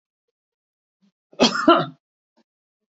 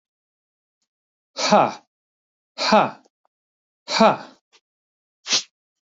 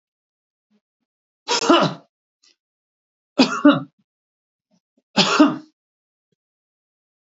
{
  "cough_length": "2.9 s",
  "cough_amplitude": 27275,
  "cough_signal_mean_std_ratio": 0.27,
  "exhalation_length": "5.9 s",
  "exhalation_amplitude": 30049,
  "exhalation_signal_mean_std_ratio": 0.3,
  "three_cough_length": "7.3 s",
  "three_cough_amplitude": 26564,
  "three_cough_signal_mean_std_ratio": 0.29,
  "survey_phase": "beta (2021-08-13 to 2022-03-07)",
  "age": "45-64",
  "gender": "Male",
  "wearing_mask": "No",
  "symptom_change_to_sense_of_smell_or_taste": true,
  "smoker_status": "Never smoked",
  "respiratory_condition_asthma": false,
  "respiratory_condition_other": false,
  "recruitment_source": "REACT",
  "submission_delay": "2 days",
  "covid_test_result": "Negative",
  "covid_test_method": "RT-qPCR",
  "influenza_a_test_result": "Negative",
  "influenza_b_test_result": "Negative"
}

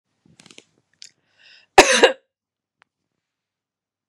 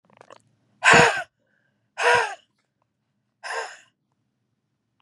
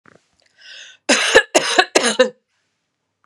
{
  "cough_length": "4.1 s",
  "cough_amplitude": 32768,
  "cough_signal_mean_std_ratio": 0.19,
  "exhalation_length": "5.0 s",
  "exhalation_amplitude": 30918,
  "exhalation_signal_mean_std_ratio": 0.29,
  "three_cough_length": "3.3 s",
  "three_cough_amplitude": 32768,
  "three_cough_signal_mean_std_ratio": 0.39,
  "survey_phase": "beta (2021-08-13 to 2022-03-07)",
  "age": "18-44",
  "gender": "Female",
  "wearing_mask": "No",
  "symptom_none": true,
  "symptom_onset": "3 days",
  "smoker_status": "Never smoked",
  "respiratory_condition_asthma": false,
  "respiratory_condition_other": false,
  "recruitment_source": "REACT",
  "submission_delay": "2 days",
  "covid_test_result": "Negative",
  "covid_test_method": "RT-qPCR",
  "influenza_a_test_result": "Negative",
  "influenza_b_test_result": "Negative"
}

